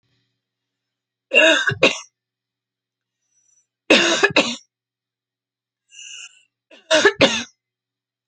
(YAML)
three_cough_length: 8.3 s
three_cough_amplitude: 32767
three_cough_signal_mean_std_ratio: 0.33
survey_phase: alpha (2021-03-01 to 2021-08-12)
age: 45-64
gender: Female
wearing_mask: 'No'
symptom_none: true
smoker_status: Current smoker (11 or more cigarettes per day)
respiratory_condition_asthma: false
respiratory_condition_other: false
recruitment_source: REACT
submission_delay: 2 days
covid_test_result: Negative
covid_test_method: RT-qPCR